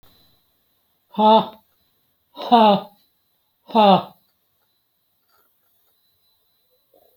{"exhalation_length": "7.2 s", "exhalation_amplitude": 27520, "exhalation_signal_mean_std_ratio": 0.29, "survey_phase": "beta (2021-08-13 to 2022-03-07)", "age": "65+", "gender": "Male", "wearing_mask": "No", "symptom_none": true, "smoker_status": "Never smoked", "respiratory_condition_asthma": false, "respiratory_condition_other": false, "recruitment_source": "REACT", "submission_delay": "3 days", "covid_test_result": "Negative", "covid_test_method": "RT-qPCR"}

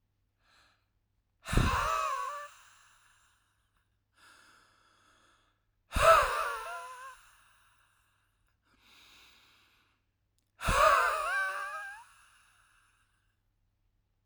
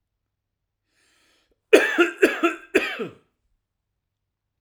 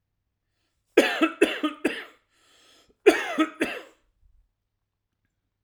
{"exhalation_length": "14.3 s", "exhalation_amplitude": 11335, "exhalation_signal_mean_std_ratio": 0.34, "three_cough_length": "4.6 s", "three_cough_amplitude": 32767, "three_cough_signal_mean_std_ratio": 0.3, "cough_length": "5.6 s", "cough_amplitude": 23465, "cough_signal_mean_std_ratio": 0.31, "survey_phase": "alpha (2021-03-01 to 2021-08-12)", "age": "45-64", "gender": "Male", "wearing_mask": "No", "symptom_none": true, "smoker_status": "Never smoked", "respiratory_condition_asthma": false, "respiratory_condition_other": false, "recruitment_source": "REACT", "submission_delay": "1 day", "covid_test_result": "Negative", "covid_test_method": "RT-qPCR"}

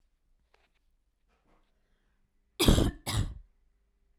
{"cough_length": "4.2 s", "cough_amplitude": 14205, "cough_signal_mean_std_ratio": 0.27, "survey_phase": "beta (2021-08-13 to 2022-03-07)", "age": "18-44", "gender": "Female", "wearing_mask": "No", "symptom_none": true, "smoker_status": "Never smoked", "respiratory_condition_asthma": false, "respiratory_condition_other": false, "recruitment_source": "REACT", "submission_delay": "3 days", "covid_test_result": "Negative", "covid_test_method": "RT-qPCR", "influenza_a_test_result": "Negative", "influenza_b_test_result": "Negative"}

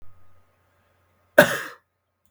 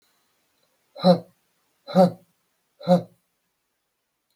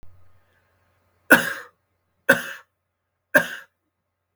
{"cough_length": "2.3 s", "cough_amplitude": 32768, "cough_signal_mean_std_ratio": 0.21, "exhalation_length": "4.4 s", "exhalation_amplitude": 21481, "exhalation_signal_mean_std_ratio": 0.25, "three_cough_length": "4.4 s", "three_cough_amplitude": 32768, "three_cough_signal_mean_std_ratio": 0.23, "survey_phase": "beta (2021-08-13 to 2022-03-07)", "age": "18-44", "gender": "Female", "wearing_mask": "No", "symptom_none": true, "smoker_status": "Never smoked", "respiratory_condition_asthma": false, "respiratory_condition_other": false, "recruitment_source": "REACT", "submission_delay": "1 day", "covid_test_result": "Negative", "covid_test_method": "RT-qPCR", "influenza_a_test_result": "Negative", "influenza_b_test_result": "Negative"}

